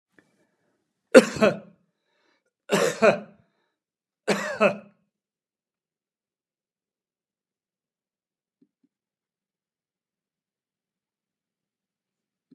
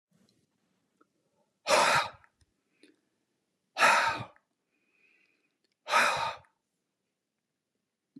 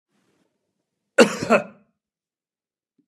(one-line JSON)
{"three_cough_length": "12.5 s", "three_cough_amplitude": 32679, "three_cough_signal_mean_std_ratio": 0.18, "exhalation_length": "8.2 s", "exhalation_amplitude": 11030, "exhalation_signal_mean_std_ratio": 0.31, "cough_length": "3.1 s", "cough_amplitude": 30643, "cough_signal_mean_std_ratio": 0.22, "survey_phase": "beta (2021-08-13 to 2022-03-07)", "age": "65+", "gender": "Male", "wearing_mask": "No", "symptom_cough_any": true, "smoker_status": "Never smoked", "respiratory_condition_asthma": false, "respiratory_condition_other": false, "recruitment_source": "REACT", "submission_delay": "2 days", "covid_test_result": "Negative", "covid_test_method": "RT-qPCR"}